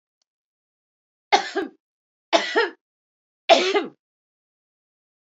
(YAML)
three_cough_length: 5.4 s
three_cough_amplitude: 27287
three_cough_signal_mean_std_ratio: 0.29
survey_phase: beta (2021-08-13 to 2022-03-07)
age: 45-64
gender: Female
wearing_mask: 'No'
symptom_none: true
smoker_status: Ex-smoker
respiratory_condition_asthma: false
respiratory_condition_other: true
recruitment_source: REACT
submission_delay: 1 day
covid_test_result: Negative
covid_test_method: RT-qPCR
influenza_a_test_result: Negative
influenza_b_test_result: Negative